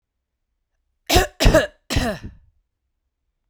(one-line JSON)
{"cough_length": "3.5 s", "cough_amplitude": 32767, "cough_signal_mean_std_ratio": 0.33, "survey_phase": "beta (2021-08-13 to 2022-03-07)", "age": "45-64", "gender": "Female", "wearing_mask": "No", "symptom_none": true, "symptom_onset": "12 days", "smoker_status": "Current smoker (1 to 10 cigarettes per day)", "respiratory_condition_asthma": false, "respiratory_condition_other": false, "recruitment_source": "REACT", "submission_delay": "1 day", "covid_test_result": "Negative", "covid_test_method": "RT-qPCR"}